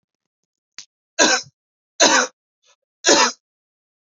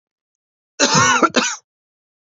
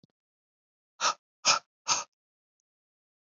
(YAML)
three_cough_length: 4.0 s
three_cough_amplitude: 32767
three_cough_signal_mean_std_ratio: 0.34
cough_length: 2.3 s
cough_amplitude: 30392
cough_signal_mean_std_ratio: 0.43
exhalation_length: 3.3 s
exhalation_amplitude: 11699
exhalation_signal_mean_std_ratio: 0.25
survey_phase: beta (2021-08-13 to 2022-03-07)
age: 18-44
gender: Male
wearing_mask: 'No'
symptom_cough_any: true
symptom_runny_or_blocked_nose: true
symptom_onset: 6 days
smoker_status: Never smoked
respiratory_condition_asthma: false
respiratory_condition_other: false
recruitment_source: Test and Trace
submission_delay: 2 days
covid_test_result: Positive
covid_test_method: RT-qPCR
covid_ct_value: 22.9
covid_ct_gene: N gene